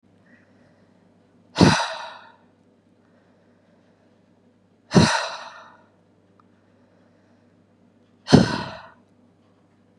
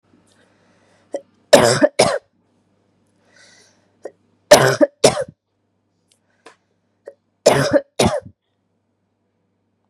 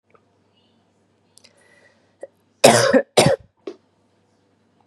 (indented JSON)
{
  "exhalation_length": "10.0 s",
  "exhalation_amplitude": 32768,
  "exhalation_signal_mean_std_ratio": 0.24,
  "three_cough_length": "9.9 s",
  "three_cough_amplitude": 32768,
  "three_cough_signal_mean_std_ratio": 0.29,
  "cough_length": "4.9 s",
  "cough_amplitude": 32768,
  "cough_signal_mean_std_ratio": 0.27,
  "survey_phase": "beta (2021-08-13 to 2022-03-07)",
  "age": "18-44",
  "gender": "Female",
  "wearing_mask": "No",
  "symptom_cough_any": true,
  "symptom_runny_or_blocked_nose": true,
  "symptom_sore_throat": true,
  "symptom_fatigue": true,
  "symptom_headache": true,
  "symptom_change_to_sense_of_smell_or_taste": true,
  "symptom_loss_of_taste": true,
  "smoker_status": "Never smoked",
  "respiratory_condition_asthma": false,
  "respiratory_condition_other": false,
  "recruitment_source": "Test and Trace",
  "submission_delay": "2 days",
  "covid_test_result": "Positive",
  "covid_test_method": "RT-qPCR",
  "covid_ct_value": 23.5,
  "covid_ct_gene": "ORF1ab gene",
  "covid_ct_mean": 24.1,
  "covid_viral_load": "13000 copies/ml",
  "covid_viral_load_category": "Low viral load (10K-1M copies/ml)"
}